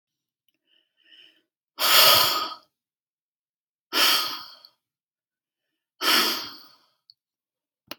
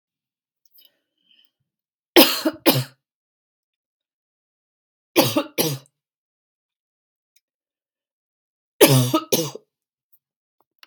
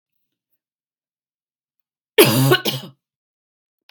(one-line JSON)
{"exhalation_length": "8.0 s", "exhalation_amplitude": 24513, "exhalation_signal_mean_std_ratio": 0.34, "three_cough_length": "10.9 s", "three_cough_amplitude": 32767, "three_cough_signal_mean_std_ratio": 0.25, "cough_length": "3.9 s", "cough_amplitude": 32768, "cough_signal_mean_std_ratio": 0.28, "survey_phase": "beta (2021-08-13 to 2022-03-07)", "age": "45-64", "gender": "Female", "wearing_mask": "No", "symptom_sore_throat": true, "symptom_headache": true, "symptom_onset": "5 days", "smoker_status": "Never smoked", "respiratory_condition_asthma": false, "respiratory_condition_other": false, "recruitment_source": "REACT", "submission_delay": "3 days", "covid_test_result": "Negative", "covid_test_method": "RT-qPCR", "influenza_a_test_result": "Negative", "influenza_b_test_result": "Negative"}